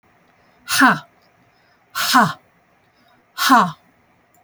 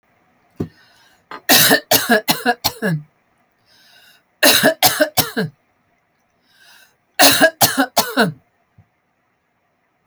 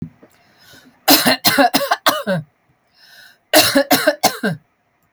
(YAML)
exhalation_length: 4.4 s
exhalation_amplitude: 29317
exhalation_signal_mean_std_ratio: 0.36
three_cough_length: 10.1 s
three_cough_amplitude: 32768
three_cough_signal_mean_std_ratio: 0.4
cough_length: 5.1 s
cough_amplitude: 32768
cough_signal_mean_std_ratio: 0.47
survey_phase: beta (2021-08-13 to 2022-03-07)
age: 65+
gender: Female
wearing_mask: 'No'
symptom_none: true
symptom_onset: 13 days
smoker_status: Never smoked
respiratory_condition_asthma: false
respiratory_condition_other: false
recruitment_source: REACT
submission_delay: 1 day
covid_test_result: Negative
covid_test_method: RT-qPCR